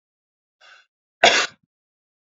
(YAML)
cough_length: 2.2 s
cough_amplitude: 27753
cough_signal_mean_std_ratio: 0.24
survey_phase: alpha (2021-03-01 to 2021-08-12)
age: 18-44
gender: Male
wearing_mask: 'No'
symptom_none: true
smoker_status: Never smoked
respiratory_condition_asthma: false
respiratory_condition_other: false
recruitment_source: REACT
submission_delay: 1 day
covid_test_result: Negative
covid_test_method: RT-qPCR